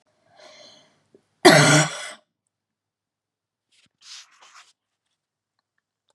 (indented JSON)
{
  "cough_length": "6.1 s",
  "cough_amplitude": 32735,
  "cough_signal_mean_std_ratio": 0.22,
  "survey_phase": "beta (2021-08-13 to 2022-03-07)",
  "age": "45-64",
  "gender": "Female",
  "wearing_mask": "No",
  "symptom_cough_any": true,
  "symptom_new_continuous_cough": true,
  "symptom_fatigue": true,
  "symptom_onset": "13 days",
  "smoker_status": "Never smoked",
  "respiratory_condition_asthma": false,
  "respiratory_condition_other": false,
  "recruitment_source": "REACT",
  "submission_delay": "1 day",
  "covid_test_result": "Negative",
  "covid_test_method": "RT-qPCR",
  "influenza_a_test_result": "Unknown/Void",
  "influenza_b_test_result": "Unknown/Void"
}